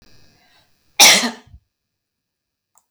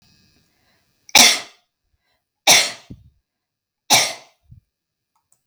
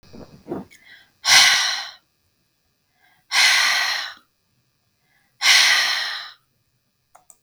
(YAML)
cough_length: 2.9 s
cough_amplitude: 32768
cough_signal_mean_std_ratio: 0.25
three_cough_length: 5.5 s
three_cough_amplitude: 32768
three_cough_signal_mean_std_ratio: 0.27
exhalation_length: 7.4 s
exhalation_amplitude: 32768
exhalation_signal_mean_std_ratio: 0.43
survey_phase: beta (2021-08-13 to 2022-03-07)
age: 45-64
gender: Female
wearing_mask: 'No'
symptom_none: true
smoker_status: Never smoked
respiratory_condition_asthma: false
respiratory_condition_other: false
recruitment_source: REACT
submission_delay: 1 day
covid_test_result: Negative
covid_test_method: RT-qPCR